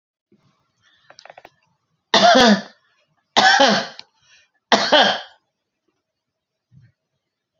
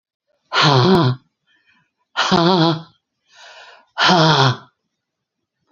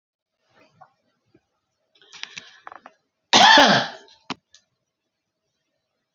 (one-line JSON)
{"three_cough_length": "7.6 s", "three_cough_amplitude": 31371, "three_cough_signal_mean_std_ratio": 0.34, "exhalation_length": "5.7 s", "exhalation_amplitude": 29588, "exhalation_signal_mean_std_ratio": 0.47, "cough_length": "6.1 s", "cough_amplitude": 31018, "cough_signal_mean_std_ratio": 0.24, "survey_phase": "beta (2021-08-13 to 2022-03-07)", "age": "65+", "gender": "Female", "wearing_mask": "No", "symptom_cough_any": true, "smoker_status": "Never smoked", "respiratory_condition_asthma": false, "respiratory_condition_other": false, "recruitment_source": "REACT", "submission_delay": "10 days", "covid_test_result": "Negative", "covid_test_method": "RT-qPCR"}